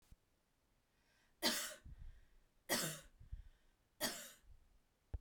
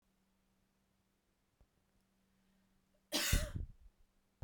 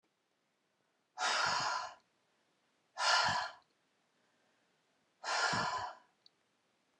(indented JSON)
{
  "three_cough_length": "5.2 s",
  "three_cough_amplitude": 2587,
  "three_cough_signal_mean_std_ratio": 0.38,
  "cough_length": "4.4 s",
  "cough_amplitude": 3556,
  "cough_signal_mean_std_ratio": 0.27,
  "exhalation_length": "7.0 s",
  "exhalation_amplitude": 3831,
  "exhalation_signal_mean_std_ratio": 0.43,
  "survey_phase": "beta (2021-08-13 to 2022-03-07)",
  "age": "45-64",
  "gender": "Female",
  "wearing_mask": "No",
  "symptom_none": true,
  "smoker_status": "Never smoked",
  "respiratory_condition_asthma": false,
  "respiratory_condition_other": false,
  "recruitment_source": "REACT",
  "submission_delay": "2 days",
  "covid_test_result": "Negative",
  "covid_test_method": "RT-qPCR"
}